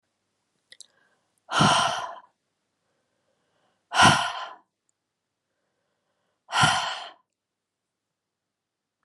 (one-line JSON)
{"exhalation_length": "9.0 s", "exhalation_amplitude": 23925, "exhalation_signal_mean_std_ratio": 0.29, "survey_phase": "alpha (2021-03-01 to 2021-08-12)", "age": "45-64", "gender": "Female", "wearing_mask": "No", "symptom_none": true, "smoker_status": "Never smoked", "respiratory_condition_asthma": false, "respiratory_condition_other": false, "recruitment_source": "REACT", "submission_delay": "1 day", "covid_test_result": "Negative", "covid_test_method": "RT-qPCR"}